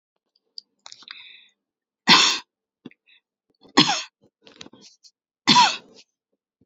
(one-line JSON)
{"three_cough_length": "6.7 s", "three_cough_amplitude": 31404, "three_cough_signal_mean_std_ratio": 0.27, "survey_phase": "beta (2021-08-13 to 2022-03-07)", "age": "18-44", "gender": "Female", "wearing_mask": "Yes", "symptom_none": true, "smoker_status": "Never smoked", "respiratory_condition_asthma": false, "respiratory_condition_other": false, "recruitment_source": "REACT", "submission_delay": "14 days", "covid_test_result": "Negative", "covid_test_method": "RT-qPCR"}